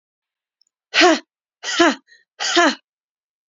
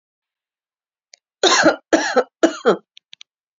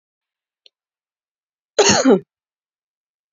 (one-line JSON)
{"exhalation_length": "3.5 s", "exhalation_amplitude": 32767, "exhalation_signal_mean_std_ratio": 0.36, "three_cough_length": "3.6 s", "three_cough_amplitude": 30752, "three_cough_signal_mean_std_ratio": 0.35, "cough_length": "3.3 s", "cough_amplitude": 31674, "cough_signal_mean_std_ratio": 0.27, "survey_phase": "beta (2021-08-13 to 2022-03-07)", "age": "18-44", "gender": "Female", "wearing_mask": "No", "symptom_none": true, "symptom_onset": "12 days", "smoker_status": "Never smoked", "respiratory_condition_asthma": false, "respiratory_condition_other": false, "recruitment_source": "REACT", "submission_delay": "1 day", "covid_test_result": "Negative", "covid_test_method": "RT-qPCR", "influenza_a_test_result": "Negative", "influenza_b_test_result": "Negative"}